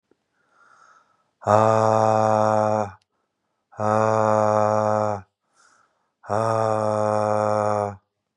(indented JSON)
{
  "exhalation_length": "8.4 s",
  "exhalation_amplitude": 28568,
  "exhalation_signal_mean_std_ratio": 0.53,
  "survey_phase": "beta (2021-08-13 to 2022-03-07)",
  "age": "18-44",
  "gender": "Male",
  "wearing_mask": "No",
  "symptom_none": true,
  "smoker_status": "Ex-smoker",
  "respiratory_condition_asthma": false,
  "respiratory_condition_other": false,
  "recruitment_source": "REACT",
  "submission_delay": "1 day",
  "covid_test_result": "Negative",
  "covid_test_method": "RT-qPCR",
  "influenza_a_test_result": "Negative",
  "influenza_b_test_result": "Negative"
}